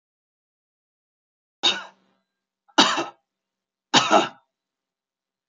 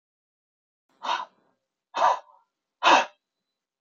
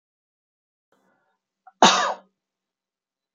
{"three_cough_length": "5.5 s", "three_cough_amplitude": 27010, "three_cough_signal_mean_std_ratio": 0.26, "exhalation_length": "3.8 s", "exhalation_amplitude": 19232, "exhalation_signal_mean_std_ratio": 0.29, "cough_length": "3.3 s", "cough_amplitude": 30871, "cough_signal_mean_std_ratio": 0.21, "survey_phase": "beta (2021-08-13 to 2022-03-07)", "age": "65+", "gender": "Male", "wearing_mask": "No", "symptom_none": true, "smoker_status": "Never smoked", "respiratory_condition_asthma": false, "respiratory_condition_other": false, "recruitment_source": "REACT", "submission_delay": "2 days", "covid_test_result": "Negative", "covid_test_method": "RT-qPCR"}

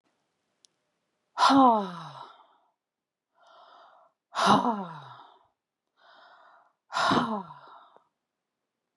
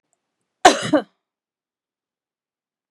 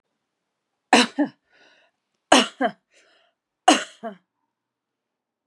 {"exhalation_length": "9.0 s", "exhalation_amplitude": 13659, "exhalation_signal_mean_std_ratio": 0.33, "cough_length": "2.9 s", "cough_amplitude": 32768, "cough_signal_mean_std_ratio": 0.2, "three_cough_length": "5.5 s", "three_cough_amplitude": 32767, "three_cough_signal_mean_std_ratio": 0.25, "survey_phase": "beta (2021-08-13 to 2022-03-07)", "age": "45-64", "gender": "Female", "wearing_mask": "No", "symptom_cough_any": true, "symptom_sore_throat": true, "symptom_fatigue": true, "symptom_headache": true, "smoker_status": "Ex-smoker", "respiratory_condition_asthma": false, "respiratory_condition_other": false, "recruitment_source": "Test and Trace", "submission_delay": "2 days", "covid_test_result": "Positive", "covid_test_method": "RT-qPCR", "covid_ct_value": 22.9, "covid_ct_gene": "N gene", "covid_ct_mean": 25.4, "covid_viral_load": "4800 copies/ml", "covid_viral_load_category": "Minimal viral load (< 10K copies/ml)"}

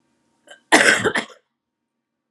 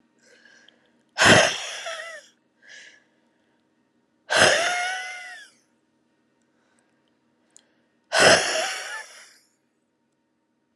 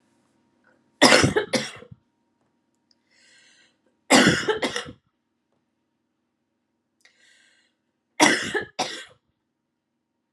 {"cough_length": "2.3 s", "cough_amplitude": 32767, "cough_signal_mean_std_ratio": 0.33, "exhalation_length": "10.8 s", "exhalation_amplitude": 29093, "exhalation_signal_mean_std_ratio": 0.33, "three_cough_length": "10.3 s", "three_cough_amplitude": 32767, "three_cough_signal_mean_std_ratio": 0.29, "survey_phase": "alpha (2021-03-01 to 2021-08-12)", "age": "45-64", "gender": "Female", "wearing_mask": "No", "symptom_fatigue": true, "symptom_headache": true, "symptom_change_to_sense_of_smell_or_taste": true, "smoker_status": "Ex-smoker", "respiratory_condition_asthma": false, "respiratory_condition_other": false, "recruitment_source": "Test and Trace", "submission_delay": "2 days", "covid_test_result": "Positive", "covid_test_method": "RT-qPCR", "covid_ct_value": 18.6, "covid_ct_gene": "ORF1ab gene", "covid_ct_mean": 18.6, "covid_viral_load": "770000 copies/ml", "covid_viral_load_category": "Low viral load (10K-1M copies/ml)"}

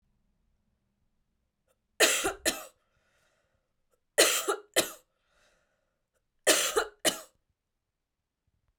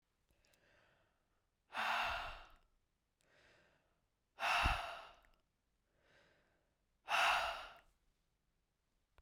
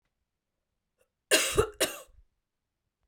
{"three_cough_length": "8.8 s", "three_cough_amplitude": 16106, "three_cough_signal_mean_std_ratio": 0.29, "exhalation_length": "9.2 s", "exhalation_amplitude": 2872, "exhalation_signal_mean_std_ratio": 0.35, "cough_length": "3.1 s", "cough_amplitude": 12236, "cough_signal_mean_std_ratio": 0.29, "survey_phase": "beta (2021-08-13 to 2022-03-07)", "age": "45-64", "gender": "Female", "wearing_mask": "No", "symptom_cough_any": true, "symptom_headache": true, "symptom_other": true, "smoker_status": "Never smoked", "respiratory_condition_asthma": true, "respiratory_condition_other": false, "recruitment_source": "Test and Trace", "submission_delay": "2 days", "covid_test_result": "Positive", "covid_test_method": "RT-qPCR", "covid_ct_value": 20.2, "covid_ct_gene": "ORF1ab gene", "covid_ct_mean": 20.8, "covid_viral_load": "150000 copies/ml", "covid_viral_load_category": "Low viral load (10K-1M copies/ml)"}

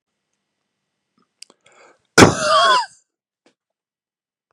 {"cough_length": "4.5 s", "cough_amplitude": 32768, "cough_signal_mean_std_ratio": 0.27, "survey_phase": "beta (2021-08-13 to 2022-03-07)", "age": "45-64", "gender": "Male", "wearing_mask": "No", "symptom_none": true, "smoker_status": "Ex-smoker", "respiratory_condition_asthma": false, "respiratory_condition_other": false, "recruitment_source": "REACT", "submission_delay": "2 days", "covid_test_result": "Negative", "covid_test_method": "RT-qPCR", "influenza_a_test_result": "Negative", "influenza_b_test_result": "Negative"}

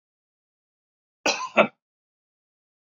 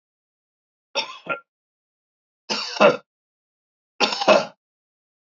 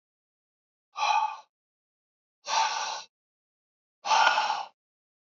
{"cough_length": "3.0 s", "cough_amplitude": 23313, "cough_signal_mean_std_ratio": 0.21, "three_cough_length": "5.4 s", "three_cough_amplitude": 28310, "three_cough_signal_mean_std_ratio": 0.28, "exhalation_length": "5.3 s", "exhalation_amplitude": 13759, "exhalation_signal_mean_std_ratio": 0.41, "survey_phase": "beta (2021-08-13 to 2022-03-07)", "age": "65+", "gender": "Male", "wearing_mask": "No", "symptom_cough_any": true, "symptom_runny_or_blocked_nose": true, "symptom_onset": "4 days", "smoker_status": "Never smoked", "respiratory_condition_asthma": false, "respiratory_condition_other": false, "recruitment_source": "REACT", "submission_delay": "1 day", "covid_test_result": "Positive", "covid_test_method": "RT-qPCR", "covid_ct_value": 18.0, "covid_ct_gene": "E gene", "influenza_a_test_result": "Negative", "influenza_b_test_result": "Negative"}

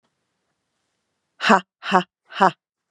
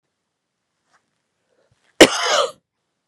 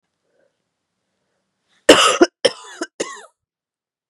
{"exhalation_length": "2.9 s", "exhalation_amplitude": 32372, "exhalation_signal_mean_std_ratio": 0.26, "cough_length": "3.1 s", "cough_amplitude": 32768, "cough_signal_mean_std_ratio": 0.23, "three_cough_length": "4.1 s", "three_cough_amplitude": 32768, "three_cough_signal_mean_std_ratio": 0.25, "survey_phase": "beta (2021-08-13 to 2022-03-07)", "age": "18-44", "gender": "Female", "wearing_mask": "No", "symptom_cough_any": true, "symptom_new_continuous_cough": true, "symptom_runny_or_blocked_nose": true, "symptom_sore_throat": true, "symptom_fatigue": true, "symptom_fever_high_temperature": true, "symptom_headache": true, "symptom_onset": "2 days", "smoker_status": "Never smoked", "respiratory_condition_asthma": false, "respiratory_condition_other": false, "recruitment_source": "Test and Trace", "submission_delay": "1 day", "covid_test_result": "Positive", "covid_test_method": "RT-qPCR", "covid_ct_value": 23.8, "covid_ct_gene": "ORF1ab gene", "covid_ct_mean": 23.8, "covid_viral_load": "16000 copies/ml", "covid_viral_load_category": "Low viral load (10K-1M copies/ml)"}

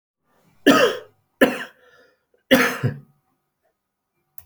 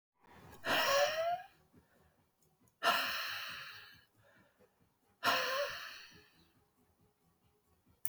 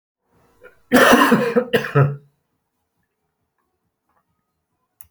{"three_cough_length": "4.5 s", "three_cough_amplitude": 28739, "three_cough_signal_mean_std_ratio": 0.32, "exhalation_length": "8.1 s", "exhalation_amplitude": 7378, "exhalation_signal_mean_std_ratio": 0.43, "cough_length": "5.1 s", "cough_amplitude": 30618, "cough_signal_mean_std_ratio": 0.35, "survey_phase": "beta (2021-08-13 to 2022-03-07)", "age": "45-64", "gender": "Male", "wearing_mask": "No", "symptom_none": true, "smoker_status": "Never smoked", "respiratory_condition_asthma": false, "respiratory_condition_other": false, "recruitment_source": "REACT", "submission_delay": "1 day", "covid_test_result": "Negative", "covid_test_method": "RT-qPCR"}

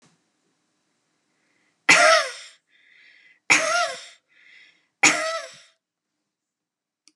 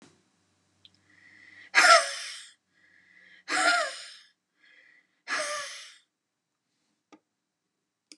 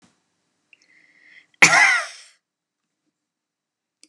{"three_cough_length": "7.2 s", "three_cough_amplitude": 31036, "three_cough_signal_mean_std_ratio": 0.31, "exhalation_length": "8.2 s", "exhalation_amplitude": 18895, "exhalation_signal_mean_std_ratio": 0.28, "cough_length": "4.1 s", "cough_amplitude": 32768, "cough_signal_mean_std_ratio": 0.25, "survey_phase": "beta (2021-08-13 to 2022-03-07)", "age": "45-64", "gender": "Female", "wearing_mask": "No", "symptom_change_to_sense_of_smell_or_taste": true, "smoker_status": "Ex-smoker", "respiratory_condition_asthma": false, "respiratory_condition_other": false, "recruitment_source": "REACT", "submission_delay": "2 days", "covid_test_result": "Negative", "covid_test_method": "RT-qPCR", "influenza_a_test_result": "Negative", "influenza_b_test_result": "Negative"}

